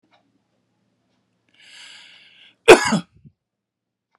cough_length: 4.2 s
cough_amplitude: 32768
cough_signal_mean_std_ratio: 0.18
survey_phase: beta (2021-08-13 to 2022-03-07)
age: 45-64
gender: Male
wearing_mask: 'No'
symptom_none: true
symptom_onset: 13 days
smoker_status: Ex-smoker
respiratory_condition_asthma: false
respiratory_condition_other: false
recruitment_source: REACT
submission_delay: 3 days
covid_test_result: Negative
covid_test_method: RT-qPCR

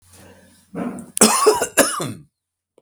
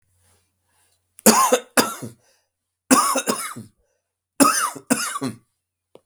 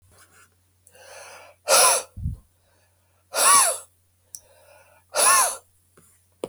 cough_length: 2.8 s
cough_amplitude: 32768
cough_signal_mean_std_ratio: 0.44
three_cough_length: 6.1 s
three_cough_amplitude: 32768
three_cough_signal_mean_std_ratio: 0.38
exhalation_length: 6.5 s
exhalation_amplitude: 24020
exhalation_signal_mean_std_ratio: 0.37
survey_phase: beta (2021-08-13 to 2022-03-07)
age: 45-64
gender: Male
wearing_mask: 'No'
symptom_none: true
smoker_status: Never smoked
respiratory_condition_asthma: false
respiratory_condition_other: false
recruitment_source: REACT
submission_delay: 1 day
covid_test_result: Negative
covid_test_method: RT-qPCR
influenza_a_test_result: Unknown/Void
influenza_b_test_result: Unknown/Void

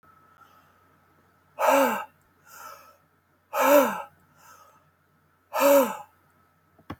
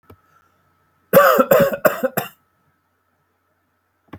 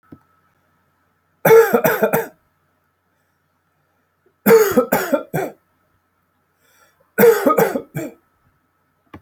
exhalation_length: 7.0 s
exhalation_amplitude: 15736
exhalation_signal_mean_std_ratio: 0.35
cough_length: 4.2 s
cough_amplitude: 30657
cough_signal_mean_std_ratio: 0.34
three_cough_length: 9.2 s
three_cough_amplitude: 32768
three_cough_signal_mean_std_ratio: 0.37
survey_phase: alpha (2021-03-01 to 2021-08-12)
age: 45-64
gender: Male
wearing_mask: 'No'
symptom_none: true
smoker_status: Never smoked
respiratory_condition_asthma: false
respiratory_condition_other: false
recruitment_source: REACT
submission_delay: 1 day
covid_test_result: Negative
covid_test_method: RT-qPCR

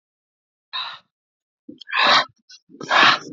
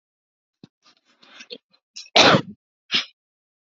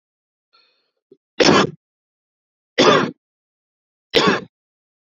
exhalation_length: 3.3 s
exhalation_amplitude: 27469
exhalation_signal_mean_std_ratio: 0.38
cough_length: 3.8 s
cough_amplitude: 30144
cough_signal_mean_std_ratio: 0.25
three_cough_length: 5.1 s
three_cough_amplitude: 32768
three_cough_signal_mean_std_ratio: 0.32
survey_phase: beta (2021-08-13 to 2022-03-07)
age: 18-44
gender: Male
wearing_mask: 'No'
symptom_none: true
smoker_status: Current smoker (11 or more cigarettes per day)
respiratory_condition_asthma: false
respiratory_condition_other: false
recruitment_source: REACT
submission_delay: 4 days
covid_test_result: Negative
covid_test_method: RT-qPCR
influenza_a_test_result: Negative
influenza_b_test_result: Negative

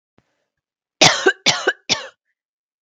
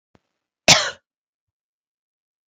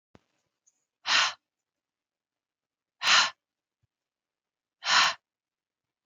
three_cough_length: 2.8 s
three_cough_amplitude: 32768
three_cough_signal_mean_std_ratio: 0.33
cough_length: 2.5 s
cough_amplitude: 32768
cough_signal_mean_std_ratio: 0.2
exhalation_length: 6.1 s
exhalation_amplitude: 13385
exhalation_signal_mean_std_ratio: 0.28
survey_phase: beta (2021-08-13 to 2022-03-07)
age: 18-44
gender: Female
wearing_mask: 'No'
symptom_cough_any: true
symptom_runny_or_blocked_nose: true
symptom_fatigue: true
smoker_status: Never smoked
respiratory_condition_asthma: false
respiratory_condition_other: false
recruitment_source: Test and Trace
submission_delay: 2 days
covid_test_result: Positive
covid_test_method: RT-qPCR
covid_ct_value: 21.6
covid_ct_gene: ORF1ab gene
covid_ct_mean: 22.2
covid_viral_load: 54000 copies/ml
covid_viral_load_category: Low viral load (10K-1M copies/ml)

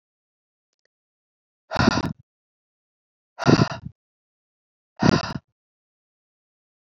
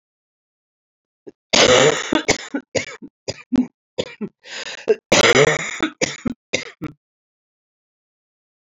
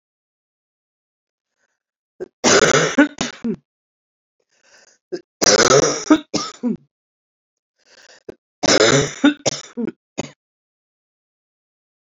exhalation_length: 7.0 s
exhalation_amplitude: 27850
exhalation_signal_mean_std_ratio: 0.24
cough_length: 8.6 s
cough_amplitude: 32767
cough_signal_mean_std_ratio: 0.38
three_cough_length: 12.1 s
three_cough_amplitude: 32768
three_cough_signal_mean_std_ratio: 0.34
survey_phase: alpha (2021-03-01 to 2021-08-12)
age: 18-44
gender: Female
wearing_mask: 'No'
symptom_cough_any: true
symptom_fatigue: true
symptom_headache: true
smoker_status: Current smoker (e-cigarettes or vapes only)
respiratory_condition_asthma: false
respiratory_condition_other: false
recruitment_source: Test and Trace
submission_delay: 1 day
covid_test_result: Positive
covid_test_method: LFT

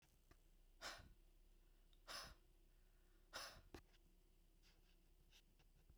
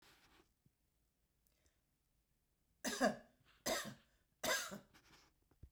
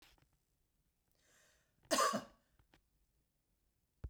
exhalation_length: 6.0 s
exhalation_amplitude: 346
exhalation_signal_mean_std_ratio: 0.64
three_cough_length: 5.7 s
three_cough_amplitude: 2506
three_cough_signal_mean_std_ratio: 0.31
cough_length: 4.1 s
cough_amplitude: 3213
cough_signal_mean_std_ratio: 0.24
survey_phase: beta (2021-08-13 to 2022-03-07)
age: 45-64
gender: Female
wearing_mask: 'No'
symptom_none: true
symptom_onset: 7 days
smoker_status: Never smoked
respiratory_condition_asthma: false
respiratory_condition_other: false
recruitment_source: REACT
submission_delay: 1 day
covid_test_result: Negative
covid_test_method: RT-qPCR
influenza_a_test_result: Unknown/Void
influenza_b_test_result: Unknown/Void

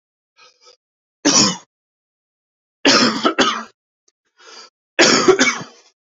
three_cough_length: 6.1 s
three_cough_amplitude: 32438
three_cough_signal_mean_std_ratio: 0.4
survey_phase: beta (2021-08-13 to 2022-03-07)
age: 18-44
gender: Male
wearing_mask: 'No'
symptom_cough_any: true
symptom_onset: 4 days
smoker_status: Never smoked
respiratory_condition_asthma: false
respiratory_condition_other: false
recruitment_source: Test and Trace
submission_delay: 2 days
covid_test_result: Positive
covid_test_method: RT-qPCR
covid_ct_value: 17.8
covid_ct_gene: S gene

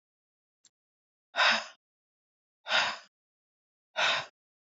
exhalation_length: 4.8 s
exhalation_amplitude: 8065
exhalation_signal_mean_std_ratio: 0.32
survey_phase: alpha (2021-03-01 to 2021-08-12)
age: 45-64
gender: Female
wearing_mask: 'No'
symptom_none: true
smoker_status: Never smoked
respiratory_condition_asthma: false
respiratory_condition_other: false
recruitment_source: REACT
submission_delay: 2 days
covid_test_result: Negative
covid_test_method: RT-qPCR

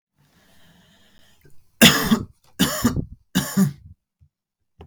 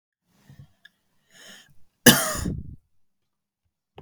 three_cough_length: 4.9 s
three_cough_amplitude: 32768
three_cough_signal_mean_std_ratio: 0.35
cough_length: 4.0 s
cough_amplitude: 32768
cough_signal_mean_std_ratio: 0.22
survey_phase: beta (2021-08-13 to 2022-03-07)
age: 18-44
gender: Male
wearing_mask: 'No'
symptom_none: true
smoker_status: Never smoked
respiratory_condition_asthma: true
respiratory_condition_other: false
recruitment_source: REACT
submission_delay: 1 day
covid_test_result: Negative
covid_test_method: RT-qPCR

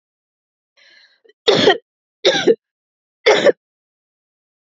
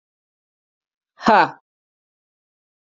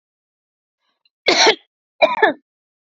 three_cough_length: 4.6 s
three_cough_amplitude: 32576
three_cough_signal_mean_std_ratio: 0.33
exhalation_length: 2.8 s
exhalation_amplitude: 28821
exhalation_signal_mean_std_ratio: 0.22
cough_length: 2.9 s
cough_amplitude: 29984
cough_signal_mean_std_ratio: 0.33
survey_phase: alpha (2021-03-01 to 2021-08-12)
age: 18-44
gender: Female
wearing_mask: 'No'
symptom_fatigue: true
symptom_headache: true
symptom_onset: 4 days
smoker_status: Never smoked
respiratory_condition_asthma: false
respiratory_condition_other: false
recruitment_source: Test and Trace
submission_delay: 2 days
covid_test_result: Positive
covid_test_method: RT-qPCR
covid_ct_value: 32.2
covid_ct_gene: ORF1ab gene
covid_ct_mean: 33.2
covid_viral_load: 13 copies/ml
covid_viral_load_category: Minimal viral load (< 10K copies/ml)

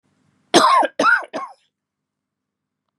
three_cough_length: 3.0 s
three_cough_amplitude: 32470
three_cough_signal_mean_std_ratio: 0.38
survey_phase: beta (2021-08-13 to 2022-03-07)
age: 45-64
gender: Female
wearing_mask: 'No'
symptom_cough_any: true
symptom_runny_or_blocked_nose: true
symptom_shortness_of_breath: true
symptom_fatigue: true
symptom_headache: true
symptom_change_to_sense_of_smell_or_taste: true
symptom_onset: 2 days
smoker_status: Never smoked
respiratory_condition_asthma: true
respiratory_condition_other: false
recruitment_source: Test and Trace
submission_delay: 2 days
covid_test_result: Positive
covid_test_method: RT-qPCR
covid_ct_value: 21.5
covid_ct_gene: ORF1ab gene
covid_ct_mean: 21.7
covid_viral_load: 76000 copies/ml
covid_viral_load_category: Low viral load (10K-1M copies/ml)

